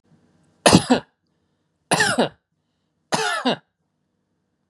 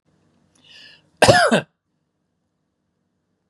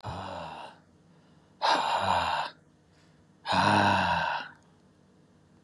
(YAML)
three_cough_length: 4.7 s
three_cough_amplitude: 32767
three_cough_signal_mean_std_ratio: 0.33
cough_length: 3.5 s
cough_amplitude: 32768
cough_signal_mean_std_ratio: 0.26
exhalation_length: 5.6 s
exhalation_amplitude: 8415
exhalation_signal_mean_std_ratio: 0.54
survey_phase: beta (2021-08-13 to 2022-03-07)
age: 45-64
gender: Male
wearing_mask: 'No'
symptom_fatigue: true
smoker_status: Never smoked
respiratory_condition_asthma: false
respiratory_condition_other: false
recruitment_source: REACT
submission_delay: 1 day
covid_test_result: Negative
covid_test_method: RT-qPCR
influenza_a_test_result: Unknown/Void
influenza_b_test_result: Unknown/Void